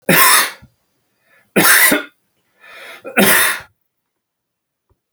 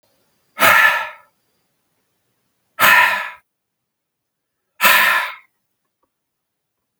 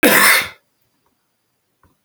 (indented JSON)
{
  "three_cough_length": "5.1 s",
  "three_cough_amplitude": 32768,
  "three_cough_signal_mean_std_ratio": 0.43,
  "exhalation_length": "7.0 s",
  "exhalation_amplitude": 32768,
  "exhalation_signal_mean_std_ratio": 0.36,
  "cough_length": "2.0 s",
  "cough_amplitude": 32768,
  "cough_signal_mean_std_ratio": 0.38,
  "survey_phase": "alpha (2021-03-01 to 2021-08-12)",
  "age": "45-64",
  "gender": "Male",
  "wearing_mask": "No",
  "symptom_none": true,
  "smoker_status": "Never smoked",
  "respiratory_condition_asthma": false,
  "respiratory_condition_other": false,
  "recruitment_source": "REACT",
  "submission_delay": "2 days",
  "covid_test_result": "Negative",
  "covid_test_method": "RT-qPCR"
}